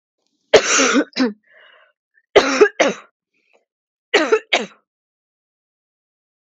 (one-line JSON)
{"three_cough_length": "6.5 s", "three_cough_amplitude": 32767, "three_cough_signal_mean_std_ratio": 0.35, "survey_phase": "beta (2021-08-13 to 2022-03-07)", "age": "18-44", "gender": "Female", "wearing_mask": "No", "symptom_none": true, "symptom_onset": "4 days", "smoker_status": "Never smoked", "respiratory_condition_asthma": false, "respiratory_condition_other": false, "recruitment_source": "REACT", "submission_delay": "1 day", "covid_test_result": "Negative", "covid_test_method": "RT-qPCR", "influenza_a_test_result": "Negative", "influenza_b_test_result": "Negative"}